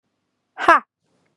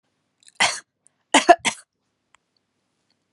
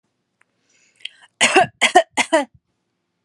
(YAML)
exhalation_length: 1.4 s
exhalation_amplitude: 32767
exhalation_signal_mean_std_ratio: 0.25
cough_length: 3.3 s
cough_amplitude: 32767
cough_signal_mean_std_ratio: 0.22
three_cough_length: 3.2 s
three_cough_amplitude: 32639
three_cough_signal_mean_std_ratio: 0.33
survey_phase: alpha (2021-03-01 to 2021-08-12)
age: 18-44
gender: Female
wearing_mask: 'No'
symptom_diarrhoea: true
smoker_status: Never smoked
respiratory_condition_asthma: false
respiratory_condition_other: false
recruitment_source: REACT
submission_delay: 1 day
covid_test_result: Negative
covid_test_method: RT-qPCR